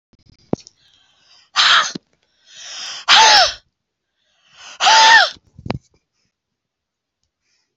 {"exhalation_length": "7.8 s", "exhalation_amplitude": 32768, "exhalation_signal_mean_std_ratio": 0.35, "survey_phase": "beta (2021-08-13 to 2022-03-07)", "age": "65+", "gender": "Female", "wearing_mask": "No", "symptom_headache": true, "smoker_status": "Ex-smoker", "respiratory_condition_asthma": false, "respiratory_condition_other": false, "recruitment_source": "REACT", "submission_delay": "0 days", "covid_test_result": "Negative", "covid_test_method": "RT-qPCR"}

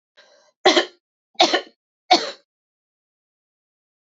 {"three_cough_length": "4.0 s", "three_cough_amplitude": 27825, "three_cough_signal_mean_std_ratio": 0.27, "survey_phase": "beta (2021-08-13 to 2022-03-07)", "age": "18-44", "gender": "Female", "wearing_mask": "No", "symptom_runny_or_blocked_nose": true, "symptom_fatigue": true, "symptom_headache": true, "symptom_other": true, "symptom_onset": "2 days", "smoker_status": "Never smoked", "respiratory_condition_asthma": false, "respiratory_condition_other": false, "recruitment_source": "Test and Trace", "submission_delay": "1 day", "covid_test_result": "Positive", "covid_test_method": "RT-qPCR", "covid_ct_value": 27.8, "covid_ct_gene": "ORF1ab gene", "covid_ct_mean": 28.2, "covid_viral_load": "570 copies/ml", "covid_viral_load_category": "Minimal viral load (< 10K copies/ml)"}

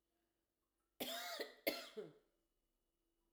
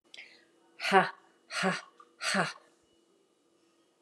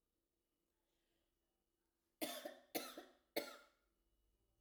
{"cough_length": "3.3 s", "cough_amplitude": 1962, "cough_signal_mean_std_ratio": 0.37, "exhalation_length": "4.0 s", "exhalation_amplitude": 14126, "exhalation_signal_mean_std_ratio": 0.33, "three_cough_length": "4.6 s", "three_cough_amplitude": 1437, "three_cough_signal_mean_std_ratio": 0.29, "survey_phase": "alpha (2021-03-01 to 2021-08-12)", "age": "45-64", "gender": "Female", "wearing_mask": "No", "symptom_fatigue": true, "smoker_status": "Never smoked", "respiratory_condition_asthma": false, "respiratory_condition_other": false, "recruitment_source": "REACT", "submission_delay": "1 day", "covid_test_result": "Negative", "covid_test_method": "RT-qPCR"}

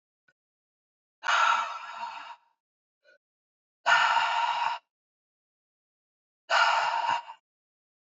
{"exhalation_length": "8.0 s", "exhalation_amplitude": 10904, "exhalation_signal_mean_std_ratio": 0.44, "survey_phase": "beta (2021-08-13 to 2022-03-07)", "age": "45-64", "gender": "Male", "wearing_mask": "No", "symptom_cough_any": true, "symptom_new_continuous_cough": true, "symptom_sore_throat": true, "symptom_headache": true, "smoker_status": "Ex-smoker", "respiratory_condition_asthma": false, "respiratory_condition_other": false, "recruitment_source": "Test and Trace", "submission_delay": "2 days", "covid_test_result": "Positive", "covid_test_method": "RT-qPCR", "covid_ct_value": 20.3, "covid_ct_gene": "ORF1ab gene", "covid_ct_mean": 20.5, "covid_viral_load": "190000 copies/ml", "covid_viral_load_category": "Low viral load (10K-1M copies/ml)"}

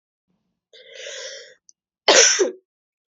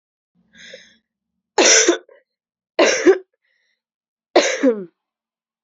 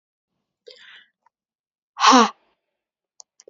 {"cough_length": "3.1 s", "cough_amplitude": 32767, "cough_signal_mean_std_ratio": 0.32, "three_cough_length": "5.6 s", "three_cough_amplitude": 31854, "three_cough_signal_mean_std_ratio": 0.35, "exhalation_length": "3.5 s", "exhalation_amplitude": 28684, "exhalation_signal_mean_std_ratio": 0.22, "survey_phase": "beta (2021-08-13 to 2022-03-07)", "age": "18-44", "gender": "Female", "wearing_mask": "No", "symptom_cough_any": true, "symptom_runny_or_blocked_nose": true, "symptom_headache": true, "symptom_onset": "4 days", "smoker_status": "Never smoked", "respiratory_condition_asthma": false, "respiratory_condition_other": false, "recruitment_source": "Test and Trace", "submission_delay": "1 day", "covid_test_result": "Positive", "covid_test_method": "RT-qPCR", "covid_ct_value": 27.0, "covid_ct_gene": "ORF1ab gene", "covid_ct_mean": 27.6, "covid_viral_load": "900 copies/ml", "covid_viral_load_category": "Minimal viral load (< 10K copies/ml)"}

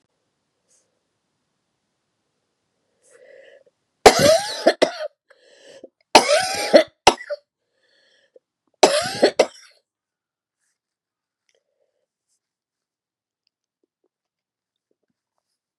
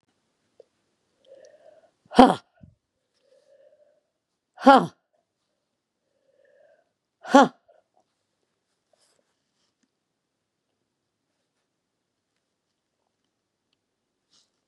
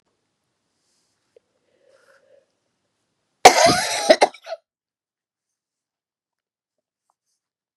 {"three_cough_length": "15.8 s", "three_cough_amplitude": 32768, "three_cough_signal_mean_std_ratio": 0.23, "exhalation_length": "14.7 s", "exhalation_amplitude": 32767, "exhalation_signal_mean_std_ratio": 0.13, "cough_length": "7.8 s", "cough_amplitude": 32768, "cough_signal_mean_std_ratio": 0.2, "survey_phase": "beta (2021-08-13 to 2022-03-07)", "age": "65+", "gender": "Female", "wearing_mask": "No", "symptom_cough_any": true, "symptom_runny_or_blocked_nose": true, "symptom_diarrhoea": true, "symptom_fatigue": true, "smoker_status": "Never smoked", "respiratory_condition_asthma": false, "respiratory_condition_other": true, "recruitment_source": "Test and Trace", "submission_delay": "1 day", "covid_test_result": "Positive", "covid_test_method": "RT-qPCR", "covid_ct_value": 15.7, "covid_ct_gene": "ORF1ab gene"}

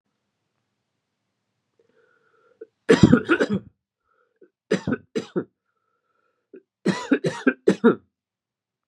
{"three_cough_length": "8.9 s", "three_cough_amplitude": 32145, "three_cough_signal_mean_std_ratio": 0.28, "survey_phase": "beta (2021-08-13 to 2022-03-07)", "age": "18-44", "gender": "Male", "wearing_mask": "No", "symptom_cough_any": true, "symptom_new_continuous_cough": true, "symptom_fatigue": true, "symptom_change_to_sense_of_smell_or_taste": true, "symptom_loss_of_taste": true, "symptom_onset": "6 days", "smoker_status": "Ex-smoker", "respiratory_condition_asthma": false, "respiratory_condition_other": false, "recruitment_source": "Test and Trace", "submission_delay": "1 day", "covid_test_result": "Positive", "covid_test_method": "RT-qPCR", "covid_ct_value": 17.2, "covid_ct_gene": "ORF1ab gene", "covid_ct_mean": 17.4, "covid_viral_load": "1900000 copies/ml", "covid_viral_load_category": "High viral load (>1M copies/ml)"}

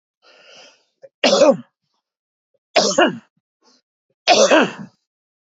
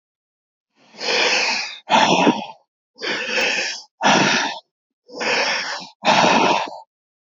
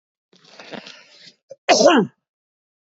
{"three_cough_length": "5.5 s", "three_cough_amplitude": 29067, "three_cough_signal_mean_std_ratio": 0.36, "exhalation_length": "7.3 s", "exhalation_amplitude": 26833, "exhalation_signal_mean_std_ratio": 0.62, "cough_length": "3.0 s", "cough_amplitude": 27937, "cough_signal_mean_std_ratio": 0.31, "survey_phase": "beta (2021-08-13 to 2022-03-07)", "age": "45-64", "gender": "Male", "wearing_mask": "No", "symptom_cough_any": true, "symptom_runny_or_blocked_nose": true, "smoker_status": "Current smoker (11 or more cigarettes per day)", "respiratory_condition_asthma": false, "respiratory_condition_other": false, "recruitment_source": "REACT", "submission_delay": "19 days", "covid_test_result": "Negative", "covid_test_method": "RT-qPCR", "influenza_a_test_result": "Negative", "influenza_b_test_result": "Negative"}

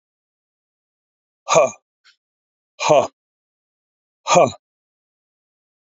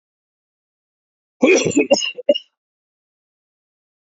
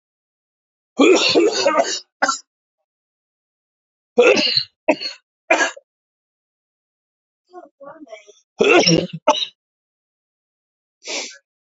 {"exhalation_length": "5.8 s", "exhalation_amplitude": 31999, "exhalation_signal_mean_std_ratio": 0.26, "cough_length": "4.2 s", "cough_amplitude": 30904, "cough_signal_mean_std_ratio": 0.3, "three_cough_length": "11.6 s", "three_cough_amplitude": 30097, "three_cough_signal_mean_std_ratio": 0.37, "survey_phase": "alpha (2021-03-01 to 2021-08-12)", "age": "45-64", "gender": "Male", "wearing_mask": "No", "symptom_cough_any": true, "symptom_new_continuous_cough": true, "symptom_shortness_of_breath": true, "symptom_diarrhoea": true, "symptom_fatigue": true, "symptom_fever_high_temperature": true, "symptom_headache": true, "smoker_status": "Never smoked", "respiratory_condition_asthma": false, "respiratory_condition_other": false, "recruitment_source": "Test and Trace", "submission_delay": "2 days", "covid_test_result": "Positive", "covid_test_method": "RT-qPCR"}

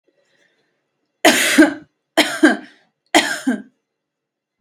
{"three_cough_length": "4.6 s", "three_cough_amplitude": 32768, "three_cough_signal_mean_std_ratio": 0.36, "survey_phase": "beta (2021-08-13 to 2022-03-07)", "age": "18-44", "gender": "Female", "wearing_mask": "No", "symptom_shortness_of_breath": true, "symptom_fatigue": true, "symptom_onset": "12 days", "smoker_status": "Ex-smoker", "respiratory_condition_asthma": false, "respiratory_condition_other": false, "recruitment_source": "REACT", "submission_delay": "4 days", "covid_test_result": "Negative", "covid_test_method": "RT-qPCR", "influenza_a_test_result": "Negative", "influenza_b_test_result": "Negative"}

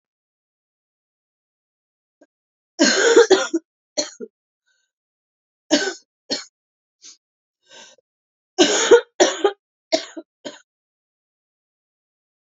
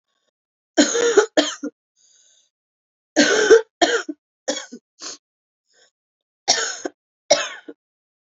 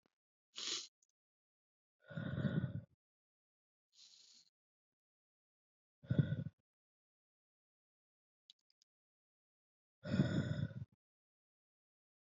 {"three_cough_length": "12.5 s", "three_cough_amplitude": 32767, "three_cough_signal_mean_std_ratio": 0.28, "cough_length": "8.4 s", "cough_amplitude": 32767, "cough_signal_mean_std_ratio": 0.35, "exhalation_length": "12.3 s", "exhalation_amplitude": 3053, "exhalation_signal_mean_std_ratio": 0.28, "survey_phase": "beta (2021-08-13 to 2022-03-07)", "age": "18-44", "gender": "Female", "wearing_mask": "No", "symptom_cough_any": true, "symptom_new_continuous_cough": true, "symptom_runny_or_blocked_nose": true, "symptom_sore_throat": true, "symptom_fever_high_temperature": true, "symptom_headache": true, "symptom_onset": "3 days", "smoker_status": "Ex-smoker", "respiratory_condition_asthma": false, "respiratory_condition_other": false, "recruitment_source": "Test and Trace", "submission_delay": "1 day", "covid_test_result": "Positive", "covid_test_method": "RT-qPCR", "covid_ct_value": 20.7, "covid_ct_gene": "ORF1ab gene", "covid_ct_mean": 20.9, "covid_viral_load": "140000 copies/ml", "covid_viral_load_category": "Low viral load (10K-1M copies/ml)"}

